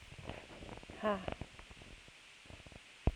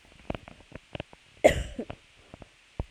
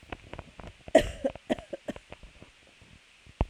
{
  "exhalation_length": "3.2 s",
  "exhalation_amplitude": 6127,
  "exhalation_signal_mean_std_ratio": 0.43,
  "cough_length": "2.9 s",
  "cough_amplitude": 20234,
  "cough_signal_mean_std_ratio": 0.25,
  "three_cough_length": "3.5 s",
  "three_cough_amplitude": 15868,
  "three_cough_signal_mean_std_ratio": 0.28,
  "survey_phase": "alpha (2021-03-01 to 2021-08-12)",
  "age": "18-44",
  "gender": "Female",
  "wearing_mask": "No",
  "symptom_cough_any": true,
  "symptom_fatigue": true,
  "symptom_fever_high_temperature": true,
  "symptom_headache": true,
  "symptom_onset": "3 days",
  "smoker_status": "Never smoked",
  "respiratory_condition_asthma": true,
  "respiratory_condition_other": false,
  "recruitment_source": "Test and Trace",
  "submission_delay": "2 days",
  "covid_test_result": "Positive",
  "covid_test_method": "RT-qPCR",
  "covid_ct_value": 19.7,
  "covid_ct_gene": "ORF1ab gene",
  "covid_ct_mean": 19.8,
  "covid_viral_load": "310000 copies/ml",
  "covid_viral_load_category": "Low viral load (10K-1M copies/ml)"
}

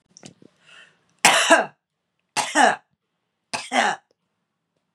{
  "three_cough_length": "4.9 s",
  "three_cough_amplitude": 32768,
  "three_cough_signal_mean_std_ratio": 0.34,
  "survey_phase": "beta (2021-08-13 to 2022-03-07)",
  "age": "45-64",
  "gender": "Female",
  "wearing_mask": "No",
  "symptom_sore_throat": true,
  "symptom_onset": "5 days",
  "smoker_status": "Never smoked",
  "respiratory_condition_asthma": false,
  "respiratory_condition_other": false,
  "recruitment_source": "Test and Trace",
  "submission_delay": "2 days",
  "covid_test_result": "Positive",
  "covid_test_method": "LAMP"
}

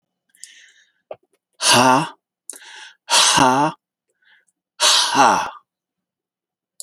{
  "exhalation_length": "6.8 s",
  "exhalation_amplitude": 32768,
  "exhalation_signal_mean_std_ratio": 0.42,
  "survey_phase": "beta (2021-08-13 to 2022-03-07)",
  "age": "65+",
  "gender": "Male",
  "wearing_mask": "No",
  "symptom_fatigue": true,
  "symptom_headache": true,
  "smoker_status": "Never smoked",
  "respiratory_condition_asthma": false,
  "respiratory_condition_other": false,
  "recruitment_source": "REACT",
  "submission_delay": "1 day",
  "covid_test_result": "Negative",
  "covid_test_method": "RT-qPCR"
}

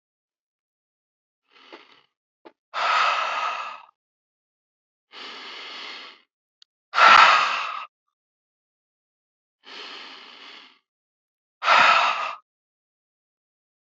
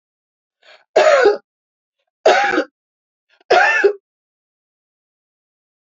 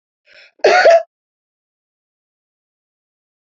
{
  "exhalation_length": "13.8 s",
  "exhalation_amplitude": 27230,
  "exhalation_signal_mean_std_ratio": 0.31,
  "three_cough_length": "6.0 s",
  "three_cough_amplitude": 28236,
  "three_cough_signal_mean_std_ratio": 0.37,
  "cough_length": "3.6 s",
  "cough_amplitude": 29183,
  "cough_signal_mean_std_ratio": 0.27,
  "survey_phase": "beta (2021-08-13 to 2022-03-07)",
  "age": "45-64",
  "gender": "Female",
  "wearing_mask": "No",
  "symptom_none": true,
  "smoker_status": "Ex-smoker",
  "respiratory_condition_asthma": false,
  "respiratory_condition_other": false,
  "recruitment_source": "REACT",
  "submission_delay": "2 days",
  "covid_test_result": "Negative",
  "covid_test_method": "RT-qPCR"
}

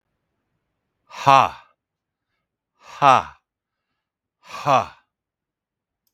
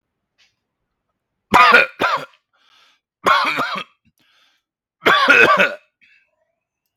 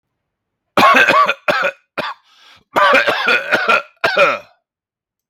{
  "exhalation_length": "6.1 s",
  "exhalation_amplitude": 32768,
  "exhalation_signal_mean_std_ratio": 0.23,
  "three_cough_length": "7.0 s",
  "three_cough_amplitude": 32768,
  "three_cough_signal_mean_std_ratio": 0.38,
  "cough_length": "5.3 s",
  "cough_amplitude": 32768,
  "cough_signal_mean_std_ratio": 0.55,
  "survey_phase": "beta (2021-08-13 to 2022-03-07)",
  "age": "45-64",
  "gender": "Male",
  "wearing_mask": "No",
  "symptom_none": true,
  "smoker_status": "Never smoked",
  "respiratory_condition_asthma": false,
  "respiratory_condition_other": false,
  "recruitment_source": "REACT",
  "submission_delay": "2 days",
  "covid_test_result": "Negative",
  "covid_test_method": "RT-qPCR"
}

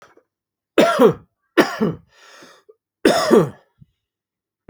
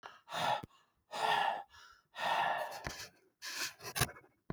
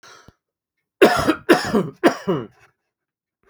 {
  "three_cough_length": "4.7 s",
  "three_cough_amplitude": 32768,
  "three_cough_signal_mean_std_ratio": 0.37,
  "exhalation_length": "4.5 s",
  "exhalation_amplitude": 4391,
  "exhalation_signal_mean_std_ratio": 0.57,
  "cough_length": "3.5 s",
  "cough_amplitude": 32768,
  "cough_signal_mean_std_ratio": 0.38,
  "survey_phase": "beta (2021-08-13 to 2022-03-07)",
  "age": "45-64",
  "gender": "Male",
  "wearing_mask": "No",
  "symptom_none": true,
  "symptom_onset": "4 days",
  "smoker_status": "Ex-smoker",
  "respiratory_condition_asthma": false,
  "respiratory_condition_other": false,
  "recruitment_source": "REACT",
  "submission_delay": "4 days",
  "covid_test_result": "Negative",
  "covid_test_method": "RT-qPCR",
  "influenza_a_test_result": "Negative",
  "influenza_b_test_result": "Negative"
}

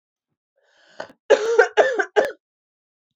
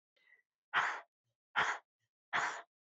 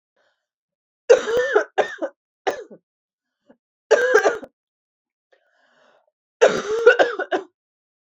{
  "cough_length": "3.2 s",
  "cough_amplitude": 26412,
  "cough_signal_mean_std_ratio": 0.36,
  "exhalation_length": "3.0 s",
  "exhalation_amplitude": 3987,
  "exhalation_signal_mean_std_ratio": 0.39,
  "three_cough_length": "8.1 s",
  "three_cough_amplitude": 28752,
  "three_cough_signal_mean_std_ratio": 0.36,
  "survey_phase": "beta (2021-08-13 to 2022-03-07)",
  "age": "18-44",
  "gender": "Female",
  "wearing_mask": "No",
  "symptom_cough_any": true,
  "symptom_runny_or_blocked_nose": true,
  "symptom_fatigue": true,
  "symptom_headache": true,
  "smoker_status": "Never smoked",
  "respiratory_condition_asthma": false,
  "respiratory_condition_other": false,
  "recruitment_source": "Test and Trace",
  "submission_delay": "2 days",
  "covid_test_result": "Positive",
  "covid_test_method": "LFT"
}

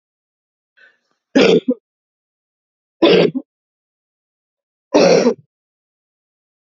{
  "three_cough_length": "6.7 s",
  "three_cough_amplitude": 32768,
  "three_cough_signal_mean_std_ratio": 0.32,
  "survey_phase": "alpha (2021-03-01 to 2021-08-12)",
  "age": "45-64",
  "gender": "Female",
  "wearing_mask": "No",
  "symptom_cough_any": true,
  "symptom_shortness_of_breath": true,
  "symptom_fatigue": true,
  "symptom_headache": true,
  "smoker_status": "Ex-smoker",
  "respiratory_condition_asthma": true,
  "respiratory_condition_other": false,
  "recruitment_source": "Test and Trace",
  "submission_delay": "1 day",
  "covid_test_result": "Positive",
  "covid_test_method": "RT-qPCR",
  "covid_ct_value": 23.6,
  "covid_ct_gene": "ORF1ab gene",
  "covid_ct_mean": 26.2,
  "covid_viral_load": "2600 copies/ml",
  "covid_viral_load_category": "Minimal viral load (< 10K copies/ml)"
}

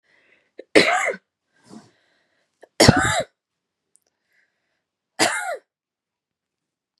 {
  "three_cough_length": "7.0 s",
  "three_cough_amplitude": 32768,
  "three_cough_signal_mean_std_ratio": 0.28,
  "survey_phase": "beta (2021-08-13 to 2022-03-07)",
  "age": "18-44",
  "gender": "Female",
  "wearing_mask": "No",
  "symptom_cough_any": true,
  "symptom_runny_or_blocked_nose": true,
  "symptom_sore_throat": true,
  "symptom_onset": "11 days",
  "smoker_status": "Never smoked",
  "respiratory_condition_asthma": false,
  "respiratory_condition_other": false,
  "recruitment_source": "REACT",
  "submission_delay": "4 days",
  "covid_test_result": "Negative",
  "covid_test_method": "RT-qPCR",
  "influenza_a_test_result": "Negative",
  "influenza_b_test_result": "Negative"
}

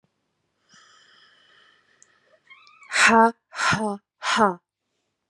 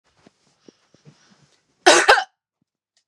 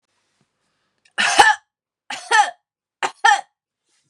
{
  "exhalation_length": "5.3 s",
  "exhalation_amplitude": 25000,
  "exhalation_signal_mean_std_ratio": 0.33,
  "cough_length": "3.1 s",
  "cough_amplitude": 32767,
  "cough_signal_mean_std_ratio": 0.25,
  "three_cough_length": "4.1 s",
  "three_cough_amplitude": 32768,
  "three_cough_signal_mean_std_ratio": 0.33,
  "survey_phase": "beta (2021-08-13 to 2022-03-07)",
  "age": "18-44",
  "gender": "Female",
  "wearing_mask": "No",
  "symptom_none": true,
  "smoker_status": "Ex-smoker",
  "respiratory_condition_asthma": false,
  "respiratory_condition_other": false,
  "recruitment_source": "REACT",
  "submission_delay": "1 day",
  "covid_test_result": "Negative",
  "covid_test_method": "RT-qPCR"
}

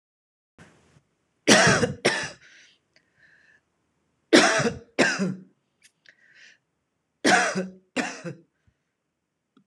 {
  "three_cough_length": "9.7 s",
  "three_cough_amplitude": 26028,
  "three_cough_signal_mean_std_ratio": 0.34,
  "survey_phase": "alpha (2021-03-01 to 2021-08-12)",
  "age": "45-64",
  "gender": "Female",
  "wearing_mask": "No",
  "symptom_none": true,
  "smoker_status": "Ex-smoker",
  "respiratory_condition_asthma": false,
  "respiratory_condition_other": false,
  "recruitment_source": "REACT",
  "submission_delay": "2 days",
  "covid_test_result": "Negative",
  "covid_test_method": "RT-qPCR"
}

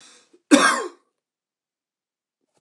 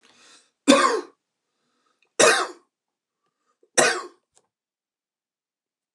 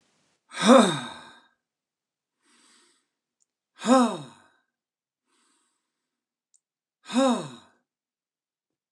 {
  "cough_length": "2.6 s",
  "cough_amplitude": 29201,
  "cough_signal_mean_std_ratio": 0.26,
  "three_cough_length": "5.9 s",
  "three_cough_amplitude": 29204,
  "three_cough_signal_mean_std_ratio": 0.28,
  "exhalation_length": "8.9 s",
  "exhalation_amplitude": 25346,
  "exhalation_signal_mean_std_ratio": 0.25,
  "survey_phase": "alpha (2021-03-01 to 2021-08-12)",
  "age": "45-64",
  "gender": "Male",
  "wearing_mask": "No",
  "symptom_none": true,
  "smoker_status": "Never smoked",
  "respiratory_condition_asthma": false,
  "respiratory_condition_other": false,
  "recruitment_source": "REACT",
  "submission_delay": "1 day",
  "covid_test_result": "Negative",
  "covid_test_method": "RT-qPCR"
}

